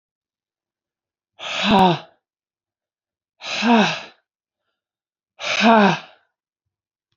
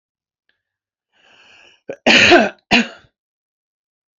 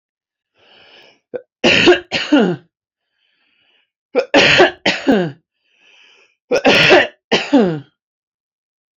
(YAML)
exhalation_length: 7.2 s
exhalation_amplitude: 27765
exhalation_signal_mean_std_ratio: 0.35
cough_length: 4.2 s
cough_amplitude: 29551
cough_signal_mean_std_ratio: 0.3
three_cough_length: 9.0 s
three_cough_amplitude: 32768
three_cough_signal_mean_std_ratio: 0.43
survey_phase: beta (2021-08-13 to 2022-03-07)
age: 45-64
gender: Female
wearing_mask: 'No'
symptom_none: true
smoker_status: Never smoked
respiratory_condition_asthma: false
respiratory_condition_other: false
recruitment_source: REACT
submission_delay: 3 days
covid_test_result: Negative
covid_test_method: RT-qPCR
influenza_a_test_result: Negative
influenza_b_test_result: Negative